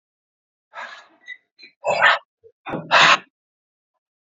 {"exhalation_length": "4.3 s", "exhalation_amplitude": 27920, "exhalation_signal_mean_std_ratio": 0.32, "survey_phase": "beta (2021-08-13 to 2022-03-07)", "age": "45-64", "gender": "Male", "wearing_mask": "No", "symptom_cough_any": true, "symptom_sore_throat": true, "symptom_onset": "7 days", "smoker_status": "Never smoked", "respiratory_condition_asthma": false, "respiratory_condition_other": false, "recruitment_source": "Test and Trace", "submission_delay": "2 days", "covid_test_result": "Positive", "covid_test_method": "RT-qPCR", "covid_ct_value": 18.0, "covid_ct_gene": "ORF1ab gene", "covid_ct_mean": 18.3, "covid_viral_load": "1000000 copies/ml", "covid_viral_load_category": "High viral load (>1M copies/ml)"}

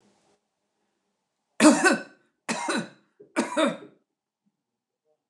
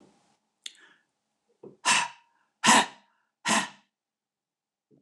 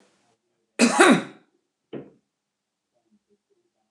{"three_cough_length": "5.3 s", "three_cough_amplitude": 23273, "three_cough_signal_mean_std_ratio": 0.31, "exhalation_length": "5.0 s", "exhalation_amplitude": 16661, "exhalation_signal_mean_std_ratio": 0.28, "cough_length": "3.9 s", "cough_amplitude": 28077, "cough_signal_mean_std_ratio": 0.26, "survey_phase": "beta (2021-08-13 to 2022-03-07)", "age": "65+", "gender": "Female", "wearing_mask": "No", "symptom_cough_any": true, "symptom_fatigue": true, "smoker_status": "Ex-smoker", "respiratory_condition_asthma": false, "respiratory_condition_other": false, "recruitment_source": "REACT", "submission_delay": "2 days", "covid_test_result": "Negative", "covid_test_method": "RT-qPCR"}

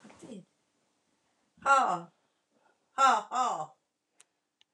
{"exhalation_length": "4.7 s", "exhalation_amplitude": 7967, "exhalation_signal_mean_std_ratio": 0.35, "survey_phase": "alpha (2021-03-01 to 2021-08-12)", "age": "65+", "gender": "Female", "wearing_mask": "No", "symptom_none": true, "smoker_status": "Ex-smoker", "respiratory_condition_asthma": false, "respiratory_condition_other": false, "recruitment_source": "REACT", "submission_delay": "4 days", "covid_test_result": "Negative", "covid_test_method": "RT-qPCR"}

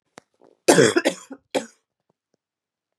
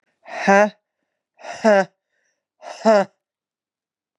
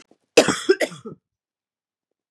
{"three_cough_length": "3.0 s", "three_cough_amplitude": 30239, "three_cough_signal_mean_std_ratio": 0.29, "exhalation_length": "4.2 s", "exhalation_amplitude": 29882, "exhalation_signal_mean_std_ratio": 0.33, "cough_length": "2.3 s", "cough_amplitude": 31603, "cough_signal_mean_std_ratio": 0.28, "survey_phase": "beta (2021-08-13 to 2022-03-07)", "age": "18-44", "gender": "Female", "wearing_mask": "No", "symptom_cough_any": true, "symptom_runny_or_blocked_nose": true, "symptom_sore_throat": true, "symptom_abdominal_pain": true, "symptom_diarrhoea": true, "symptom_fatigue": true, "symptom_headache": true, "symptom_change_to_sense_of_smell_or_taste": true, "symptom_other": true, "smoker_status": "Never smoked", "respiratory_condition_asthma": true, "respiratory_condition_other": false, "recruitment_source": "Test and Trace", "submission_delay": "2 days", "covid_test_result": "Positive", "covid_test_method": "LFT"}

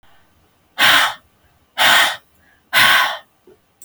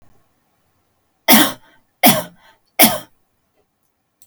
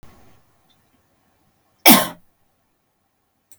{"exhalation_length": "3.8 s", "exhalation_amplitude": 32767, "exhalation_signal_mean_std_ratio": 0.45, "three_cough_length": "4.3 s", "three_cough_amplitude": 32768, "three_cough_signal_mean_std_ratio": 0.29, "cough_length": "3.6 s", "cough_amplitude": 32768, "cough_signal_mean_std_ratio": 0.19, "survey_phase": "beta (2021-08-13 to 2022-03-07)", "age": "18-44", "gender": "Female", "wearing_mask": "No", "symptom_none": true, "smoker_status": "Never smoked", "respiratory_condition_asthma": false, "respiratory_condition_other": false, "recruitment_source": "REACT", "submission_delay": "2 days", "covid_test_result": "Negative", "covid_test_method": "RT-qPCR"}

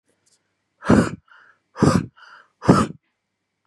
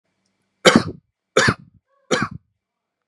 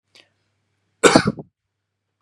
{"exhalation_length": "3.7 s", "exhalation_amplitude": 32768, "exhalation_signal_mean_std_ratio": 0.33, "three_cough_length": "3.1 s", "three_cough_amplitude": 32768, "three_cough_signal_mean_std_ratio": 0.3, "cough_length": "2.2 s", "cough_amplitude": 32768, "cough_signal_mean_std_ratio": 0.24, "survey_phase": "beta (2021-08-13 to 2022-03-07)", "age": "18-44", "gender": "Male", "wearing_mask": "No", "symptom_runny_or_blocked_nose": true, "symptom_sore_throat": true, "symptom_fatigue": true, "symptom_headache": true, "smoker_status": "Ex-smoker", "respiratory_condition_asthma": false, "respiratory_condition_other": false, "recruitment_source": "Test and Trace", "submission_delay": "2 days", "covid_test_result": "Positive", "covid_test_method": "LFT"}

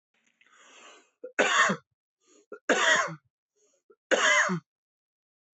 {"three_cough_length": "5.5 s", "three_cough_amplitude": 12720, "three_cough_signal_mean_std_ratio": 0.4, "survey_phase": "beta (2021-08-13 to 2022-03-07)", "age": "18-44", "gender": "Male", "wearing_mask": "No", "symptom_none": true, "smoker_status": "Never smoked", "respiratory_condition_asthma": true, "respiratory_condition_other": false, "recruitment_source": "REACT", "submission_delay": "1 day", "covid_test_result": "Negative", "covid_test_method": "RT-qPCR", "influenza_a_test_result": "Negative", "influenza_b_test_result": "Negative"}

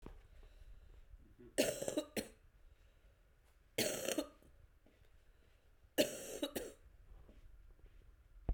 {"three_cough_length": "8.5 s", "three_cough_amplitude": 3868, "three_cough_signal_mean_std_ratio": 0.39, "survey_phase": "beta (2021-08-13 to 2022-03-07)", "age": "45-64", "gender": "Female", "wearing_mask": "No", "symptom_cough_any": true, "symptom_runny_or_blocked_nose": true, "symptom_sore_throat": true, "symptom_diarrhoea": true, "symptom_fatigue": true, "symptom_headache": true, "symptom_change_to_sense_of_smell_or_taste": true, "symptom_loss_of_taste": true, "symptom_onset": "4 days", "smoker_status": "Current smoker (1 to 10 cigarettes per day)", "respiratory_condition_asthma": false, "respiratory_condition_other": false, "recruitment_source": "Test and Trace", "submission_delay": "2 days", "covid_test_result": "Positive", "covid_test_method": "RT-qPCR"}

